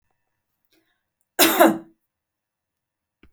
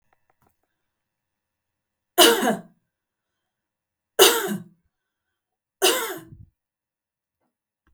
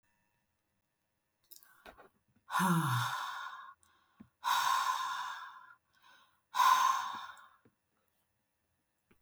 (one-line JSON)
{"cough_length": "3.3 s", "cough_amplitude": 29938, "cough_signal_mean_std_ratio": 0.25, "three_cough_length": "7.9 s", "three_cough_amplitude": 32767, "three_cough_signal_mean_std_ratio": 0.26, "exhalation_length": "9.2 s", "exhalation_amplitude": 5341, "exhalation_signal_mean_std_ratio": 0.43, "survey_phase": "beta (2021-08-13 to 2022-03-07)", "age": "65+", "gender": "Female", "wearing_mask": "No", "symptom_none": true, "smoker_status": "Never smoked", "respiratory_condition_asthma": false, "respiratory_condition_other": false, "recruitment_source": "REACT", "submission_delay": "3 days", "covid_test_result": "Negative", "covid_test_method": "RT-qPCR", "influenza_a_test_result": "Negative", "influenza_b_test_result": "Negative"}